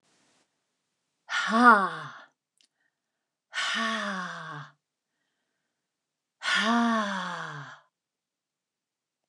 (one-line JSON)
{"exhalation_length": "9.3 s", "exhalation_amplitude": 21776, "exhalation_signal_mean_std_ratio": 0.36, "survey_phase": "alpha (2021-03-01 to 2021-08-12)", "age": "65+", "gender": "Female", "wearing_mask": "No", "symptom_none": true, "smoker_status": "Never smoked", "respiratory_condition_asthma": false, "respiratory_condition_other": false, "recruitment_source": "REACT", "submission_delay": "1 day", "covid_test_result": "Negative", "covid_test_method": "RT-qPCR"}